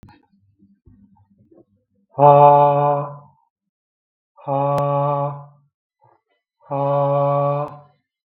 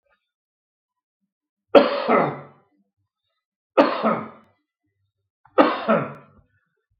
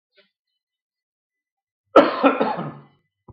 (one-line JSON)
{"exhalation_length": "8.3 s", "exhalation_amplitude": 32768, "exhalation_signal_mean_std_ratio": 0.44, "three_cough_length": "7.0 s", "three_cough_amplitude": 32768, "three_cough_signal_mean_std_ratio": 0.31, "cough_length": "3.3 s", "cough_amplitude": 32768, "cough_signal_mean_std_ratio": 0.28, "survey_phase": "beta (2021-08-13 to 2022-03-07)", "age": "45-64", "gender": "Male", "wearing_mask": "No", "symptom_none": true, "smoker_status": "Never smoked", "respiratory_condition_asthma": false, "respiratory_condition_other": false, "recruitment_source": "REACT", "submission_delay": "2 days", "covid_test_result": "Negative", "covid_test_method": "RT-qPCR"}